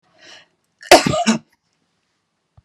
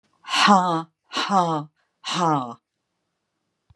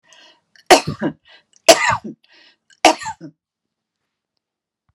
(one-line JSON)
{"cough_length": "2.6 s", "cough_amplitude": 32768, "cough_signal_mean_std_ratio": 0.27, "exhalation_length": "3.8 s", "exhalation_amplitude": 27203, "exhalation_signal_mean_std_ratio": 0.47, "three_cough_length": "4.9 s", "three_cough_amplitude": 32768, "three_cough_signal_mean_std_ratio": 0.26, "survey_phase": "beta (2021-08-13 to 2022-03-07)", "age": "65+", "gender": "Female", "wearing_mask": "No", "symptom_none": true, "smoker_status": "Never smoked", "respiratory_condition_asthma": false, "respiratory_condition_other": false, "recruitment_source": "REACT", "submission_delay": "1 day", "covid_test_result": "Negative", "covid_test_method": "RT-qPCR"}